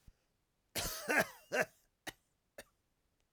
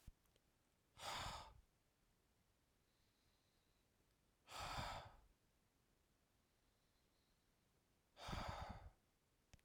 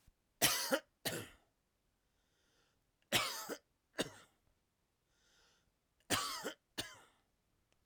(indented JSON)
{
  "cough_length": "3.3 s",
  "cough_amplitude": 3865,
  "cough_signal_mean_std_ratio": 0.32,
  "exhalation_length": "9.6 s",
  "exhalation_amplitude": 559,
  "exhalation_signal_mean_std_ratio": 0.4,
  "three_cough_length": "7.9 s",
  "three_cough_amplitude": 6592,
  "three_cough_signal_mean_std_ratio": 0.32,
  "survey_phase": "alpha (2021-03-01 to 2021-08-12)",
  "age": "45-64",
  "gender": "Male",
  "wearing_mask": "No",
  "symptom_none": true,
  "smoker_status": "Ex-smoker",
  "respiratory_condition_asthma": false,
  "respiratory_condition_other": false,
  "recruitment_source": "REACT",
  "submission_delay": "3 days",
  "covid_test_result": "Negative",
  "covid_test_method": "RT-qPCR"
}